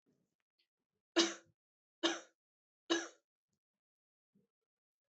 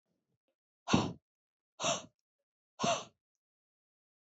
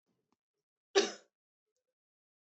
{
  "three_cough_length": "5.1 s",
  "three_cough_amplitude": 5841,
  "three_cough_signal_mean_std_ratio": 0.22,
  "exhalation_length": "4.4 s",
  "exhalation_amplitude": 7959,
  "exhalation_signal_mean_std_ratio": 0.28,
  "cough_length": "2.5 s",
  "cough_amplitude": 7751,
  "cough_signal_mean_std_ratio": 0.17,
  "survey_phase": "alpha (2021-03-01 to 2021-08-12)",
  "age": "18-44",
  "gender": "Female",
  "wearing_mask": "No",
  "symptom_none": true,
  "smoker_status": "Never smoked",
  "respiratory_condition_asthma": false,
  "respiratory_condition_other": false,
  "recruitment_source": "REACT",
  "submission_delay": "3 days",
  "covid_test_result": "Negative",
  "covid_test_method": "RT-qPCR"
}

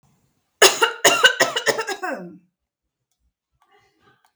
{
  "cough_length": "4.4 s",
  "cough_amplitude": 32768,
  "cough_signal_mean_std_ratio": 0.35,
  "survey_phase": "beta (2021-08-13 to 2022-03-07)",
  "age": "45-64",
  "gender": "Female",
  "wearing_mask": "No",
  "symptom_none": true,
  "smoker_status": "Never smoked",
  "respiratory_condition_asthma": false,
  "respiratory_condition_other": false,
  "recruitment_source": "REACT",
  "submission_delay": "3 days",
  "covid_test_result": "Negative",
  "covid_test_method": "RT-qPCR",
  "influenza_a_test_result": "Negative",
  "influenza_b_test_result": "Negative"
}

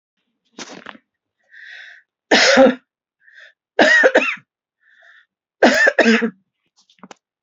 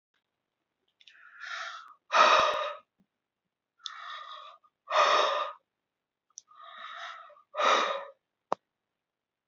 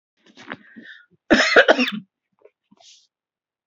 {
  "three_cough_length": "7.4 s",
  "three_cough_amplitude": 28883,
  "three_cough_signal_mean_std_ratio": 0.38,
  "exhalation_length": "9.5 s",
  "exhalation_amplitude": 12781,
  "exhalation_signal_mean_std_ratio": 0.37,
  "cough_length": "3.7 s",
  "cough_amplitude": 28679,
  "cough_signal_mean_std_ratio": 0.3,
  "survey_phase": "beta (2021-08-13 to 2022-03-07)",
  "age": "65+",
  "gender": "Female",
  "wearing_mask": "No",
  "symptom_none": true,
  "smoker_status": "Never smoked",
  "respiratory_condition_asthma": false,
  "respiratory_condition_other": false,
  "recruitment_source": "REACT",
  "submission_delay": "1 day",
  "covid_test_result": "Negative",
  "covid_test_method": "RT-qPCR",
  "influenza_a_test_result": "Negative",
  "influenza_b_test_result": "Negative"
}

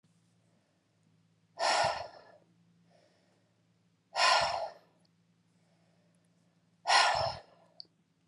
{
  "exhalation_length": "8.3 s",
  "exhalation_amplitude": 8278,
  "exhalation_signal_mean_std_ratio": 0.34,
  "survey_phase": "alpha (2021-03-01 to 2021-08-12)",
  "age": "45-64",
  "gender": "Female",
  "wearing_mask": "No",
  "symptom_cough_any": true,
  "smoker_status": "Ex-smoker",
  "respiratory_condition_asthma": false,
  "respiratory_condition_other": false,
  "recruitment_source": "REACT",
  "submission_delay": "3 days",
  "covid_test_result": "Negative",
  "covid_test_method": "RT-qPCR"
}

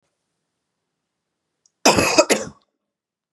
{
  "cough_length": "3.3 s",
  "cough_amplitude": 32767,
  "cough_signal_mean_std_ratio": 0.28,
  "survey_phase": "beta (2021-08-13 to 2022-03-07)",
  "age": "45-64",
  "gender": "Female",
  "wearing_mask": "No",
  "symptom_none": true,
  "smoker_status": "Never smoked",
  "respiratory_condition_asthma": false,
  "respiratory_condition_other": false,
  "recruitment_source": "REACT",
  "submission_delay": "3 days",
  "covid_test_result": "Negative",
  "covid_test_method": "RT-qPCR"
}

